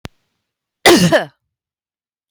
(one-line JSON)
{"cough_length": "2.3 s", "cough_amplitude": 32767, "cough_signal_mean_std_ratio": 0.33, "survey_phase": "beta (2021-08-13 to 2022-03-07)", "age": "45-64", "gender": "Female", "wearing_mask": "No", "symptom_none": true, "smoker_status": "Ex-smoker", "respiratory_condition_asthma": true, "respiratory_condition_other": false, "recruitment_source": "REACT", "submission_delay": "2 days", "covid_test_result": "Negative", "covid_test_method": "RT-qPCR", "influenza_a_test_result": "Negative", "influenza_b_test_result": "Negative"}